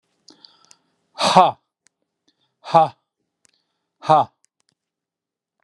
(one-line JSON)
{"exhalation_length": "5.6 s", "exhalation_amplitude": 32767, "exhalation_signal_mean_std_ratio": 0.25, "survey_phase": "beta (2021-08-13 to 2022-03-07)", "age": "65+", "gender": "Male", "wearing_mask": "No", "symptom_none": true, "smoker_status": "Ex-smoker", "respiratory_condition_asthma": false, "respiratory_condition_other": false, "recruitment_source": "REACT", "submission_delay": "9 days", "covid_test_result": "Negative", "covid_test_method": "RT-qPCR", "influenza_a_test_result": "Unknown/Void", "influenza_b_test_result": "Unknown/Void"}